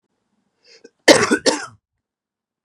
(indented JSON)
{
  "cough_length": "2.6 s",
  "cough_amplitude": 32768,
  "cough_signal_mean_std_ratio": 0.28,
  "survey_phase": "beta (2021-08-13 to 2022-03-07)",
  "age": "45-64",
  "gender": "Male",
  "wearing_mask": "No",
  "symptom_cough_any": true,
  "symptom_runny_or_blocked_nose": true,
  "symptom_shortness_of_breath": true,
  "symptom_sore_throat": true,
  "symptom_fatigue": true,
  "symptom_fever_high_temperature": true,
  "symptom_headache": true,
  "symptom_change_to_sense_of_smell_or_taste": true,
  "symptom_loss_of_taste": true,
  "symptom_other": true,
  "symptom_onset": "4 days",
  "smoker_status": "Never smoked",
  "respiratory_condition_asthma": false,
  "respiratory_condition_other": false,
  "recruitment_source": "Test and Trace",
  "submission_delay": "3 days",
  "covid_test_result": "Positive",
  "covid_test_method": "RT-qPCR",
  "covid_ct_value": 16.5,
  "covid_ct_gene": "ORF1ab gene",
  "covid_ct_mean": 16.9,
  "covid_viral_load": "2900000 copies/ml",
  "covid_viral_load_category": "High viral load (>1M copies/ml)"
}